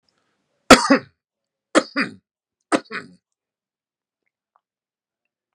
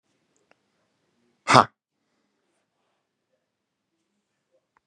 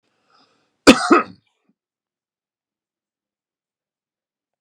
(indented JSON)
{
  "three_cough_length": "5.5 s",
  "three_cough_amplitude": 32768,
  "three_cough_signal_mean_std_ratio": 0.2,
  "exhalation_length": "4.9 s",
  "exhalation_amplitude": 32485,
  "exhalation_signal_mean_std_ratio": 0.12,
  "cough_length": "4.6 s",
  "cough_amplitude": 32768,
  "cough_signal_mean_std_ratio": 0.18,
  "survey_phase": "beta (2021-08-13 to 2022-03-07)",
  "age": "45-64",
  "gender": "Male",
  "wearing_mask": "No",
  "symptom_none": true,
  "smoker_status": "Ex-smoker",
  "respiratory_condition_asthma": false,
  "respiratory_condition_other": false,
  "recruitment_source": "REACT",
  "submission_delay": "1 day",
  "covid_test_result": "Negative",
  "covid_test_method": "RT-qPCR",
  "influenza_a_test_result": "Negative",
  "influenza_b_test_result": "Negative"
}